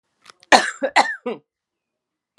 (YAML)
three_cough_length: 2.4 s
three_cough_amplitude: 32768
three_cough_signal_mean_std_ratio: 0.3
survey_phase: alpha (2021-03-01 to 2021-08-12)
age: 65+
gender: Female
wearing_mask: 'No'
symptom_none: true
smoker_status: Ex-smoker
respiratory_condition_asthma: false
respiratory_condition_other: false
recruitment_source: REACT
submission_delay: 3 days
covid_test_result: Negative
covid_test_method: RT-qPCR